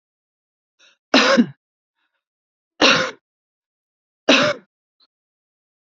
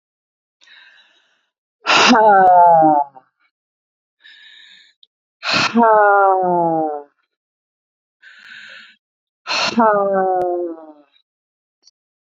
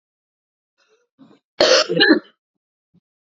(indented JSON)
{
  "three_cough_length": "5.9 s",
  "three_cough_amplitude": 29991,
  "three_cough_signal_mean_std_ratio": 0.3,
  "exhalation_length": "12.2 s",
  "exhalation_amplitude": 32767,
  "exhalation_signal_mean_std_ratio": 0.46,
  "cough_length": "3.3 s",
  "cough_amplitude": 32768,
  "cough_signal_mean_std_ratio": 0.32,
  "survey_phase": "beta (2021-08-13 to 2022-03-07)",
  "age": "45-64",
  "gender": "Female",
  "wearing_mask": "No",
  "symptom_none": true,
  "smoker_status": "Prefer not to say",
  "respiratory_condition_asthma": false,
  "respiratory_condition_other": false,
  "recruitment_source": "REACT",
  "submission_delay": "3 days",
  "covid_test_result": "Negative",
  "covid_test_method": "RT-qPCR",
  "influenza_a_test_result": "Negative",
  "influenza_b_test_result": "Negative"
}